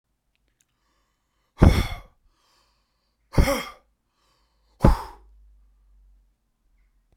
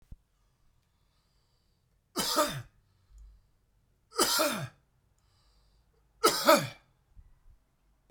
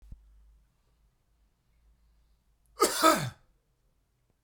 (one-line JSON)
{"exhalation_length": "7.2 s", "exhalation_amplitude": 32767, "exhalation_signal_mean_std_ratio": 0.23, "three_cough_length": "8.1 s", "three_cough_amplitude": 14391, "three_cough_signal_mean_std_ratio": 0.3, "cough_length": "4.4 s", "cough_amplitude": 14456, "cough_signal_mean_std_ratio": 0.24, "survey_phase": "beta (2021-08-13 to 2022-03-07)", "age": "45-64", "gender": "Male", "wearing_mask": "No", "symptom_none": true, "smoker_status": "Prefer not to say", "respiratory_condition_asthma": true, "respiratory_condition_other": false, "recruitment_source": "REACT", "submission_delay": "1 day", "covid_test_result": "Negative", "covid_test_method": "RT-qPCR"}